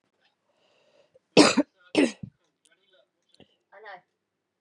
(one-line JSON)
{"cough_length": "4.6 s", "cough_amplitude": 29063, "cough_signal_mean_std_ratio": 0.22, "survey_phase": "beta (2021-08-13 to 2022-03-07)", "age": "18-44", "gender": "Female", "wearing_mask": "No", "symptom_cough_any": true, "symptom_runny_or_blocked_nose": true, "symptom_fatigue": true, "smoker_status": "Current smoker (1 to 10 cigarettes per day)", "respiratory_condition_asthma": false, "respiratory_condition_other": false, "recruitment_source": "Test and Trace", "submission_delay": "2 days", "covid_test_result": "Positive", "covid_test_method": "LFT"}